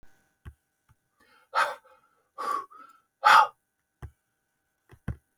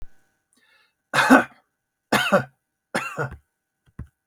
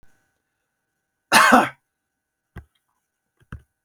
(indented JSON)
{
  "exhalation_length": "5.4 s",
  "exhalation_amplitude": 18702,
  "exhalation_signal_mean_std_ratio": 0.25,
  "three_cough_length": "4.3 s",
  "three_cough_amplitude": 32766,
  "three_cough_signal_mean_std_ratio": 0.32,
  "cough_length": "3.8 s",
  "cough_amplitude": 32766,
  "cough_signal_mean_std_ratio": 0.24,
  "survey_phase": "beta (2021-08-13 to 2022-03-07)",
  "age": "65+",
  "gender": "Male",
  "wearing_mask": "No",
  "symptom_none": true,
  "smoker_status": "Ex-smoker",
  "respiratory_condition_asthma": false,
  "respiratory_condition_other": false,
  "recruitment_source": "REACT",
  "submission_delay": "2 days",
  "covid_test_result": "Negative",
  "covid_test_method": "RT-qPCR",
  "influenza_a_test_result": "Negative",
  "influenza_b_test_result": "Negative"
}